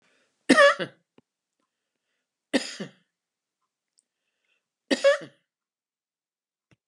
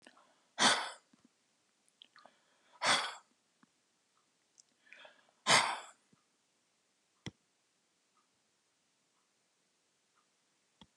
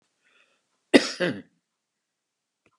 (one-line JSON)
{"three_cough_length": "6.9 s", "three_cough_amplitude": 23151, "three_cough_signal_mean_std_ratio": 0.22, "exhalation_length": "11.0 s", "exhalation_amplitude": 7932, "exhalation_signal_mean_std_ratio": 0.22, "cough_length": "2.8 s", "cough_amplitude": 30883, "cough_signal_mean_std_ratio": 0.2, "survey_phase": "alpha (2021-03-01 to 2021-08-12)", "age": "65+", "gender": "Female", "wearing_mask": "No", "symptom_none": true, "smoker_status": "Ex-smoker", "respiratory_condition_asthma": true, "respiratory_condition_other": false, "recruitment_source": "REACT", "submission_delay": "3 days", "covid_test_result": "Negative", "covid_test_method": "RT-qPCR"}